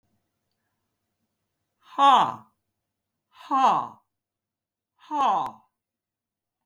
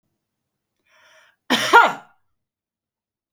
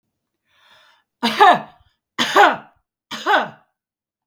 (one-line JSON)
{"exhalation_length": "6.7 s", "exhalation_amplitude": 16711, "exhalation_signal_mean_std_ratio": 0.3, "cough_length": "3.3 s", "cough_amplitude": 32768, "cough_signal_mean_std_ratio": 0.24, "three_cough_length": "4.3 s", "three_cough_amplitude": 32766, "three_cough_signal_mean_std_ratio": 0.35, "survey_phase": "beta (2021-08-13 to 2022-03-07)", "age": "45-64", "gender": "Female", "wearing_mask": "No", "symptom_none": true, "smoker_status": "Ex-smoker", "respiratory_condition_asthma": false, "respiratory_condition_other": false, "recruitment_source": "REACT", "submission_delay": "1 day", "covid_test_result": "Negative", "covid_test_method": "RT-qPCR", "influenza_a_test_result": "Negative", "influenza_b_test_result": "Negative"}